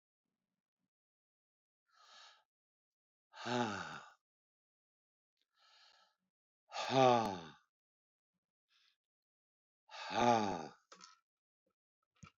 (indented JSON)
{
  "exhalation_length": "12.4 s",
  "exhalation_amplitude": 5075,
  "exhalation_signal_mean_std_ratio": 0.26,
  "survey_phase": "beta (2021-08-13 to 2022-03-07)",
  "age": "65+",
  "gender": "Male",
  "wearing_mask": "No",
  "symptom_none": true,
  "smoker_status": "Ex-smoker",
  "respiratory_condition_asthma": false,
  "respiratory_condition_other": false,
  "recruitment_source": "REACT",
  "submission_delay": "5 days",
  "covid_test_result": "Negative",
  "covid_test_method": "RT-qPCR"
}